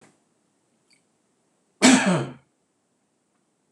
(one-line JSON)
{"exhalation_length": "3.7 s", "exhalation_amplitude": 25731, "exhalation_signal_mean_std_ratio": 0.26, "survey_phase": "beta (2021-08-13 to 2022-03-07)", "age": "45-64", "gender": "Male", "wearing_mask": "No", "symptom_none": true, "smoker_status": "Ex-smoker", "respiratory_condition_asthma": false, "respiratory_condition_other": false, "recruitment_source": "REACT", "submission_delay": "2 days", "covid_test_result": "Negative", "covid_test_method": "RT-qPCR", "influenza_a_test_result": "Negative", "influenza_b_test_result": "Negative"}